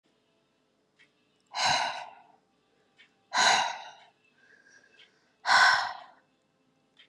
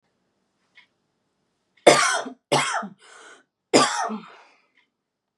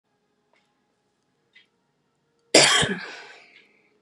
{"exhalation_length": "7.1 s", "exhalation_amplitude": 12536, "exhalation_signal_mean_std_ratio": 0.34, "three_cough_length": "5.4 s", "three_cough_amplitude": 31167, "three_cough_signal_mean_std_ratio": 0.32, "cough_length": "4.0 s", "cough_amplitude": 31955, "cough_signal_mean_std_ratio": 0.26, "survey_phase": "beta (2021-08-13 to 2022-03-07)", "age": "18-44", "gender": "Female", "wearing_mask": "No", "symptom_cough_any": true, "symptom_new_continuous_cough": true, "symptom_headache": true, "symptom_onset": "5 days", "smoker_status": "Never smoked", "respiratory_condition_asthma": true, "respiratory_condition_other": false, "recruitment_source": "REACT", "submission_delay": "1 day", "covid_test_result": "Negative", "covid_test_method": "RT-qPCR"}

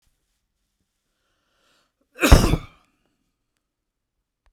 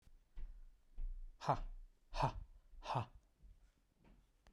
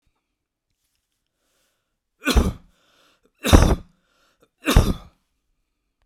{"cough_length": "4.5 s", "cough_amplitude": 32768, "cough_signal_mean_std_ratio": 0.19, "exhalation_length": "4.5 s", "exhalation_amplitude": 2739, "exhalation_signal_mean_std_ratio": 0.48, "three_cough_length": "6.1 s", "three_cough_amplitude": 32768, "three_cough_signal_mean_std_ratio": 0.26, "survey_phase": "beta (2021-08-13 to 2022-03-07)", "age": "45-64", "gender": "Male", "wearing_mask": "No", "symptom_none": true, "smoker_status": "Never smoked", "respiratory_condition_asthma": false, "respiratory_condition_other": false, "recruitment_source": "REACT", "submission_delay": "2 days", "covid_test_result": "Negative", "covid_test_method": "RT-qPCR"}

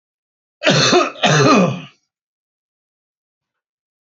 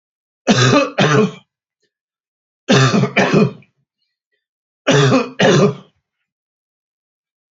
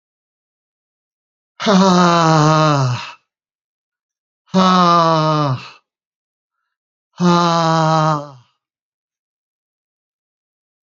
{"cough_length": "4.0 s", "cough_amplitude": 30242, "cough_signal_mean_std_ratio": 0.42, "three_cough_length": "7.5 s", "three_cough_amplitude": 31130, "three_cough_signal_mean_std_ratio": 0.46, "exhalation_length": "10.8 s", "exhalation_amplitude": 32767, "exhalation_signal_mean_std_ratio": 0.47, "survey_phase": "beta (2021-08-13 to 2022-03-07)", "age": "65+", "gender": "Male", "wearing_mask": "No", "symptom_none": true, "smoker_status": "Ex-smoker", "respiratory_condition_asthma": false, "respiratory_condition_other": false, "recruitment_source": "REACT", "submission_delay": "3 days", "covid_test_result": "Positive", "covid_test_method": "RT-qPCR", "covid_ct_value": 37.0, "covid_ct_gene": "E gene", "influenza_a_test_result": "Negative", "influenza_b_test_result": "Negative"}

